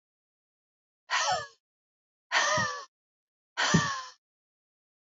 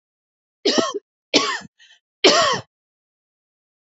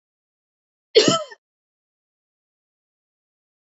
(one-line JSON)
{"exhalation_length": "5.0 s", "exhalation_amplitude": 9009, "exhalation_signal_mean_std_ratio": 0.4, "three_cough_length": "3.9 s", "three_cough_amplitude": 30468, "three_cough_signal_mean_std_ratio": 0.36, "cough_length": "3.8 s", "cough_amplitude": 27387, "cough_signal_mean_std_ratio": 0.19, "survey_phase": "beta (2021-08-13 to 2022-03-07)", "age": "45-64", "gender": "Female", "wearing_mask": "No", "symptom_none": true, "smoker_status": "Never smoked", "respiratory_condition_asthma": false, "respiratory_condition_other": false, "recruitment_source": "REACT", "submission_delay": "3 days", "covid_test_result": "Negative", "covid_test_method": "RT-qPCR", "influenza_a_test_result": "Negative", "influenza_b_test_result": "Negative"}